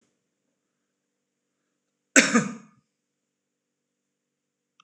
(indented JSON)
{
  "cough_length": "4.8 s",
  "cough_amplitude": 26028,
  "cough_signal_mean_std_ratio": 0.18,
  "survey_phase": "beta (2021-08-13 to 2022-03-07)",
  "age": "45-64",
  "gender": "Male",
  "wearing_mask": "No",
  "symptom_none": true,
  "smoker_status": "Ex-smoker",
  "respiratory_condition_asthma": false,
  "respiratory_condition_other": false,
  "recruitment_source": "REACT",
  "submission_delay": "1 day",
  "covid_test_result": "Negative",
  "covid_test_method": "RT-qPCR"
}